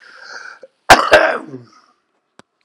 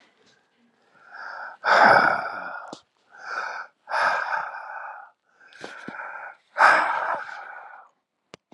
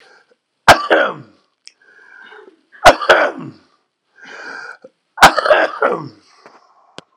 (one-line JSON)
{"cough_length": "2.6 s", "cough_amplitude": 32768, "cough_signal_mean_std_ratio": 0.32, "exhalation_length": "8.5 s", "exhalation_amplitude": 29722, "exhalation_signal_mean_std_ratio": 0.43, "three_cough_length": "7.2 s", "three_cough_amplitude": 32768, "three_cough_signal_mean_std_ratio": 0.34, "survey_phase": "alpha (2021-03-01 to 2021-08-12)", "age": "45-64", "gender": "Male", "wearing_mask": "No", "symptom_fatigue": true, "symptom_onset": "5 days", "smoker_status": "Ex-smoker", "respiratory_condition_asthma": true, "respiratory_condition_other": false, "recruitment_source": "Test and Trace", "submission_delay": "2 days", "covid_test_result": "Positive", "covid_test_method": "RT-qPCR", "covid_ct_value": 14.9, "covid_ct_gene": "N gene", "covid_ct_mean": 15.1, "covid_viral_load": "11000000 copies/ml", "covid_viral_load_category": "High viral load (>1M copies/ml)"}